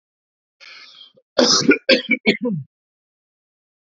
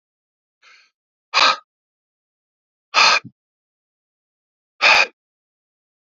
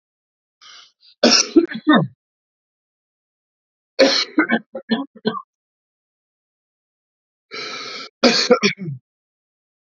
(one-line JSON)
{"cough_length": "3.8 s", "cough_amplitude": 29658, "cough_signal_mean_std_ratio": 0.36, "exhalation_length": "6.1 s", "exhalation_amplitude": 30987, "exhalation_signal_mean_std_ratio": 0.27, "three_cough_length": "9.9 s", "three_cough_amplitude": 32767, "three_cough_signal_mean_std_ratio": 0.34, "survey_phase": "beta (2021-08-13 to 2022-03-07)", "age": "18-44", "gender": "Male", "wearing_mask": "No", "symptom_runny_or_blocked_nose": true, "symptom_shortness_of_breath": true, "symptom_onset": "5 days", "smoker_status": "Never smoked", "respiratory_condition_asthma": false, "respiratory_condition_other": false, "recruitment_source": "REACT", "submission_delay": "1 day", "covid_test_result": "Negative", "covid_test_method": "RT-qPCR", "influenza_a_test_result": "Negative", "influenza_b_test_result": "Negative"}